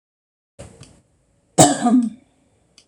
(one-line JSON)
{"cough_length": "2.9 s", "cough_amplitude": 26028, "cough_signal_mean_std_ratio": 0.32, "survey_phase": "alpha (2021-03-01 to 2021-08-12)", "age": "65+", "gender": "Female", "wearing_mask": "No", "symptom_none": true, "smoker_status": "Ex-smoker", "respiratory_condition_asthma": false, "respiratory_condition_other": false, "recruitment_source": "REACT", "submission_delay": "2 days", "covid_test_result": "Negative", "covid_test_method": "RT-qPCR"}